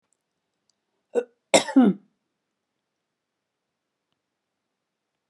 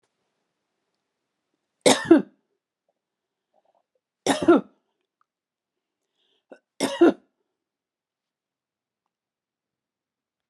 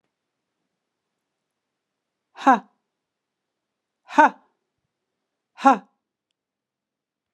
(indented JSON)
{
  "cough_length": "5.3 s",
  "cough_amplitude": 25137,
  "cough_signal_mean_std_ratio": 0.2,
  "three_cough_length": "10.5 s",
  "three_cough_amplitude": 26042,
  "three_cough_signal_mean_std_ratio": 0.2,
  "exhalation_length": "7.3 s",
  "exhalation_amplitude": 30369,
  "exhalation_signal_mean_std_ratio": 0.16,
  "survey_phase": "alpha (2021-03-01 to 2021-08-12)",
  "age": "45-64",
  "gender": "Female",
  "wearing_mask": "No",
  "symptom_none": true,
  "smoker_status": "Ex-smoker",
  "respiratory_condition_asthma": false,
  "respiratory_condition_other": false,
  "recruitment_source": "REACT",
  "submission_delay": "1 day",
  "covid_test_result": "Negative",
  "covid_test_method": "RT-qPCR"
}